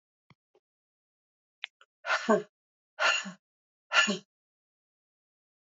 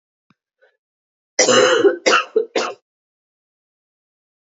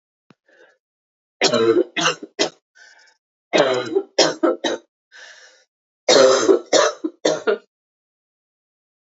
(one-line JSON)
{"exhalation_length": "5.6 s", "exhalation_amplitude": 11097, "exhalation_signal_mean_std_ratio": 0.28, "cough_length": "4.5 s", "cough_amplitude": 28948, "cough_signal_mean_std_ratio": 0.37, "three_cough_length": "9.1 s", "three_cough_amplitude": 30006, "three_cough_signal_mean_std_ratio": 0.42, "survey_phase": "alpha (2021-03-01 to 2021-08-12)", "age": "45-64", "gender": "Female", "wearing_mask": "No", "symptom_cough_any": true, "symptom_fatigue": true, "symptom_headache": true, "symptom_change_to_sense_of_smell_or_taste": true, "symptom_loss_of_taste": true, "symptom_onset": "3 days", "smoker_status": "Never smoked", "respiratory_condition_asthma": false, "respiratory_condition_other": false, "recruitment_source": "Test and Trace", "submission_delay": "1 day", "covid_test_result": "Positive", "covid_test_method": "RT-qPCR", "covid_ct_value": 17.8, "covid_ct_gene": "ORF1ab gene", "covid_ct_mean": 18.9, "covid_viral_load": "650000 copies/ml", "covid_viral_load_category": "Low viral load (10K-1M copies/ml)"}